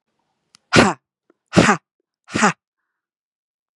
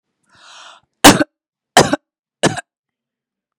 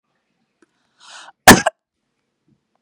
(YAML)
exhalation_length: 3.8 s
exhalation_amplitude: 32768
exhalation_signal_mean_std_ratio: 0.29
three_cough_length: 3.6 s
three_cough_amplitude: 32768
three_cough_signal_mean_std_ratio: 0.25
cough_length: 2.8 s
cough_amplitude: 32768
cough_signal_mean_std_ratio: 0.18
survey_phase: beta (2021-08-13 to 2022-03-07)
age: 45-64
gender: Female
wearing_mask: 'No'
symptom_none: true
smoker_status: Ex-smoker
recruitment_source: REACT
submission_delay: 2 days
covid_test_result: Negative
covid_test_method: RT-qPCR
influenza_a_test_result: Negative
influenza_b_test_result: Negative